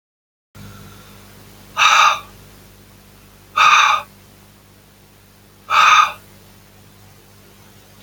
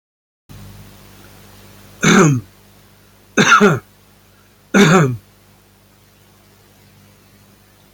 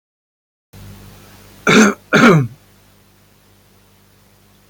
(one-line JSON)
{"exhalation_length": "8.0 s", "exhalation_amplitude": 32088, "exhalation_signal_mean_std_ratio": 0.36, "three_cough_length": "7.9 s", "three_cough_amplitude": 32653, "three_cough_signal_mean_std_ratio": 0.35, "cough_length": "4.7 s", "cough_amplitude": 32692, "cough_signal_mean_std_ratio": 0.32, "survey_phase": "beta (2021-08-13 to 2022-03-07)", "age": "65+", "gender": "Male", "wearing_mask": "No", "symptom_change_to_sense_of_smell_or_taste": true, "symptom_loss_of_taste": true, "symptom_other": true, "symptom_onset": "3 days", "smoker_status": "Ex-smoker", "respiratory_condition_asthma": false, "respiratory_condition_other": false, "recruitment_source": "Test and Trace", "submission_delay": "1 day", "covid_test_result": "Positive", "covid_test_method": "RT-qPCR", "covid_ct_value": 15.6, "covid_ct_gene": "ORF1ab gene"}